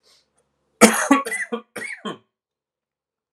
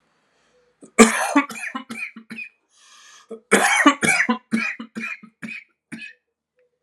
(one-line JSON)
{"three_cough_length": "3.3 s", "three_cough_amplitude": 32768, "three_cough_signal_mean_std_ratio": 0.31, "cough_length": "6.8 s", "cough_amplitude": 32768, "cough_signal_mean_std_ratio": 0.39, "survey_phase": "alpha (2021-03-01 to 2021-08-12)", "age": "18-44", "gender": "Male", "wearing_mask": "No", "symptom_cough_any": true, "symptom_headache": true, "smoker_status": "Never smoked", "respiratory_condition_asthma": false, "respiratory_condition_other": false, "recruitment_source": "Test and Trace", "submission_delay": "2 days", "covid_test_result": "Positive", "covid_test_method": "RT-qPCR", "covid_ct_value": 31.1, "covid_ct_gene": "ORF1ab gene", "covid_ct_mean": 31.1, "covid_viral_load": "63 copies/ml", "covid_viral_load_category": "Minimal viral load (< 10K copies/ml)"}